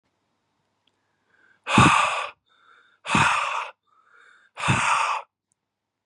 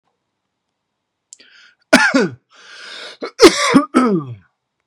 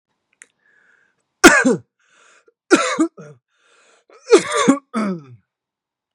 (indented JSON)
{
  "exhalation_length": "6.1 s",
  "exhalation_amplitude": 26751,
  "exhalation_signal_mean_std_ratio": 0.42,
  "cough_length": "4.9 s",
  "cough_amplitude": 32768,
  "cough_signal_mean_std_ratio": 0.37,
  "three_cough_length": "6.1 s",
  "three_cough_amplitude": 32768,
  "three_cough_signal_mean_std_ratio": 0.33,
  "survey_phase": "beta (2021-08-13 to 2022-03-07)",
  "age": "18-44",
  "gender": "Male",
  "wearing_mask": "No",
  "symptom_none": true,
  "smoker_status": "Never smoked",
  "respiratory_condition_asthma": false,
  "respiratory_condition_other": false,
  "recruitment_source": "REACT",
  "submission_delay": "2 days",
  "covid_test_result": "Negative",
  "covid_test_method": "RT-qPCR",
  "influenza_a_test_result": "Negative",
  "influenza_b_test_result": "Negative"
}